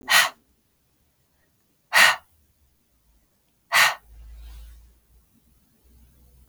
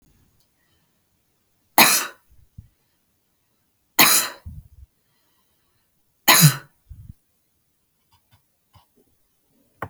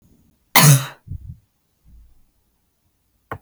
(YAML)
exhalation_length: 6.5 s
exhalation_amplitude: 26086
exhalation_signal_mean_std_ratio: 0.27
three_cough_length: 9.9 s
three_cough_amplitude: 32768
three_cough_signal_mean_std_ratio: 0.23
cough_length: 3.4 s
cough_amplitude: 32768
cough_signal_mean_std_ratio: 0.26
survey_phase: beta (2021-08-13 to 2022-03-07)
age: 18-44
gender: Female
wearing_mask: 'No'
symptom_none: true
smoker_status: Never smoked
respiratory_condition_asthma: false
respiratory_condition_other: false
recruitment_source: REACT
submission_delay: 0 days
covid_test_result: Negative
covid_test_method: RT-qPCR
influenza_a_test_result: Negative
influenza_b_test_result: Negative